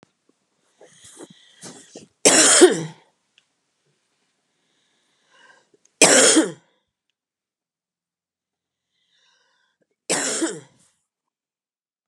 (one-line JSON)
{"three_cough_length": "12.1 s", "three_cough_amplitude": 32767, "three_cough_signal_mean_std_ratio": 0.26, "survey_phase": "beta (2021-08-13 to 2022-03-07)", "age": "65+", "gender": "Female", "wearing_mask": "No", "symptom_none": true, "smoker_status": "Ex-smoker", "respiratory_condition_asthma": false, "respiratory_condition_other": false, "recruitment_source": "REACT", "submission_delay": "7 days", "covid_test_result": "Negative", "covid_test_method": "RT-qPCR", "influenza_a_test_result": "Negative", "influenza_b_test_result": "Negative"}